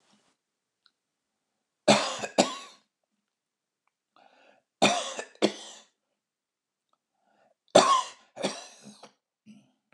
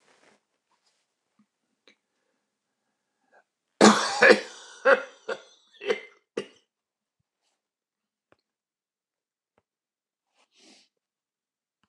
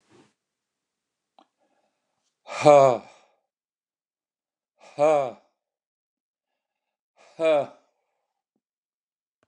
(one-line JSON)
{"three_cough_length": "9.9 s", "three_cough_amplitude": 23751, "three_cough_signal_mean_std_ratio": 0.26, "cough_length": "11.9 s", "cough_amplitude": 27604, "cough_signal_mean_std_ratio": 0.19, "exhalation_length": "9.5 s", "exhalation_amplitude": 26264, "exhalation_signal_mean_std_ratio": 0.23, "survey_phase": "beta (2021-08-13 to 2022-03-07)", "age": "65+", "gender": "Male", "wearing_mask": "No", "symptom_none": true, "smoker_status": "Ex-smoker", "respiratory_condition_asthma": false, "respiratory_condition_other": false, "recruitment_source": "REACT", "submission_delay": "2 days", "covid_test_result": "Negative", "covid_test_method": "RT-qPCR", "influenza_a_test_result": "Negative", "influenza_b_test_result": "Negative"}